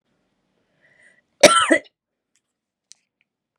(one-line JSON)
{"cough_length": "3.6 s", "cough_amplitude": 32768, "cough_signal_mean_std_ratio": 0.22, "survey_phase": "beta (2021-08-13 to 2022-03-07)", "age": "18-44", "gender": "Female", "wearing_mask": "No", "symptom_runny_or_blocked_nose": true, "symptom_shortness_of_breath": true, "symptom_sore_throat": true, "symptom_fatigue": true, "symptom_headache": true, "symptom_onset": "2 days", "smoker_status": "Never smoked", "respiratory_condition_asthma": true, "respiratory_condition_other": false, "recruitment_source": "Test and Trace", "submission_delay": "0 days", "covid_test_result": "Negative", "covid_test_method": "ePCR"}